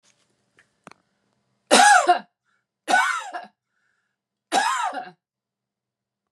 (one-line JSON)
{"three_cough_length": "6.3 s", "three_cough_amplitude": 29398, "three_cough_signal_mean_std_ratio": 0.34, "survey_phase": "beta (2021-08-13 to 2022-03-07)", "age": "65+", "gender": "Male", "wearing_mask": "Yes", "symptom_none": true, "smoker_status": "Ex-smoker", "respiratory_condition_asthma": false, "respiratory_condition_other": false, "recruitment_source": "Test and Trace", "submission_delay": "2 days", "covid_test_result": "Negative", "covid_test_method": "RT-qPCR"}